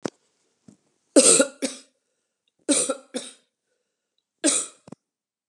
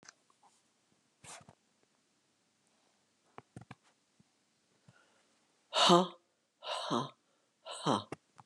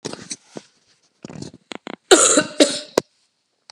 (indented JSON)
{
  "three_cough_length": "5.5 s",
  "three_cough_amplitude": 30476,
  "three_cough_signal_mean_std_ratio": 0.29,
  "exhalation_length": "8.5 s",
  "exhalation_amplitude": 10808,
  "exhalation_signal_mean_std_ratio": 0.23,
  "cough_length": "3.7 s",
  "cough_amplitude": 32768,
  "cough_signal_mean_std_ratio": 0.31,
  "survey_phase": "beta (2021-08-13 to 2022-03-07)",
  "age": "65+",
  "gender": "Female",
  "wearing_mask": "No",
  "symptom_cough_any": true,
  "symptom_runny_or_blocked_nose": true,
  "symptom_fever_high_temperature": true,
  "symptom_onset": "2 days",
  "smoker_status": "Never smoked",
  "respiratory_condition_asthma": false,
  "respiratory_condition_other": false,
  "recruitment_source": "Test and Trace",
  "submission_delay": "1 day",
  "covid_test_result": "Negative",
  "covid_test_method": "RT-qPCR"
}